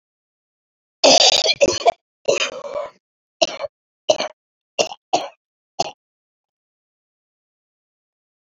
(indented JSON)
{
  "cough_length": "8.5 s",
  "cough_amplitude": 31550,
  "cough_signal_mean_std_ratio": 0.31,
  "survey_phase": "beta (2021-08-13 to 2022-03-07)",
  "age": "65+",
  "gender": "Female",
  "wearing_mask": "No",
  "symptom_cough_any": true,
  "symptom_new_continuous_cough": true,
  "symptom_shortness_of_breath": true,
  "symptom_fatigue": true,
  "symptom_headache": true,
  "symptom_onset": "7 days",
  "smoker_status": "Never smoked",
  "respiratory_condition_asthma": true,
  "respiratory_condition_other": false,
  "recruitment_source": "REACT",
  "submission_delay": "1 day",
  "covid_test_result": "Negative",
  "covid_test_method": "RT-qPCR",
  "influenza_a_test_result": "Negative",
  "influenza_b_test_result": "Negative"
}